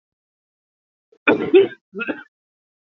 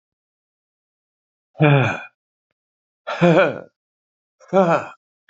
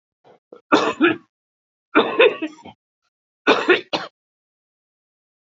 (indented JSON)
{
  "cough_length": "2.8 s",
  "cough_amplitude": 27771,
  "cough_signal_mean_std_ratio": 0.3,
  "exhalation_length": "5.3 s",
  "exhalation_amplitude": 27285,
  "exhalation_signal_mean_std_ratio": 0.35,
  "three_cough_length": "5.5 s",
  "three_cough_amplitude": 30611,
  "three_cough_signal_mean_std_ratio": 0.35,
  "survey_phase": "beta (2021-08-13 to 2022-03-07)",
  "age": "65+",
  "gender": "Male",
  "wearing_mask": "No",
  "symptom_new_continuous_cough": true,
  "symptom_runny_or_blocked_nose": true,
  "symptom_shortness_of_breath": true,
  "symptom_fatigue": true,
  "symptom_headache": true,
  "symptom_onset": "9 days",
  "smoker_status": "Ex-smoker",
  "respiratory_condition_asthma": false,
  "respiratory_condition_other": true,
  "recruitment_source": "Test and Trace",
  "submission_delay": "1 day",
  "covid_test_result": "Positive",
  "covid_test_method": "RT-qPCR",
  "covid_ct_value": 20.7,
  "covid_ct_gene": "ORF1ab gene",
  "covid_ct_mean": 21.0,
  "covid_viral_load": "130000 copies/ml",
  "covid_viral_load_category": "Low viral load (10K-1M copies/ml)"
}